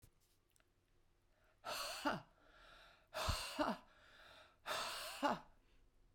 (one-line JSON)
{"exhalation_length": "6.1 s", "exhalation_amplitude": 1779, "exhalation_signal_mean_std_ratio": 0.46, "survey_phase": "beta (2021-08-13 to 2022-03-07)", "age": "45-64", "gender": "Female", "wearing_mask": "No", "symptom_none": true, "smoker_status": "Ex-smoker", "respiratory_condition_asthma": false, "respiratory_condition_other": false, "recruitment_source": "REACT", "submission_delay": "8 days", "covid_test_result": "Negative", "covid_test_method": "RT-qPCR"}